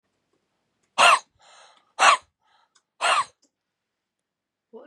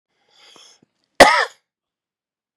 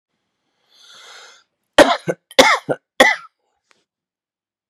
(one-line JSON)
{"exhalation_length": "4.9 s", "exhalation_amplitude": 29175, "exhalation_signal_mean_std_ratio": 0.28, "cough_length": "2.6 s", "cough_amplitude": 32768, "cough_signal_mean_std_ratio": 0.22, "three_cough_length": "4.7 s", "three_cough_amplitude": 32768, "three_cough_signal_mean_std_ratio": 0.27, "survey_phase": "beta (2021-08-13 to 2022-03-07)", "age": "18-44", "gender": "Male", "wearing_mask": "No", "symptom_none": true, "smoker_status": "Current smoker (e-cigarettes or vapes only)", "respiratory_condition_asthma": true, "respiratory_condition_other": false, "recruitment_source": "REACT", "submission_delay": "5 days", "covid_test_result": "Negative", "covid_test_method": "RT-qPCR", "influenza_a_test_result": "Negative", "influenza_b_test_result": "Negative"}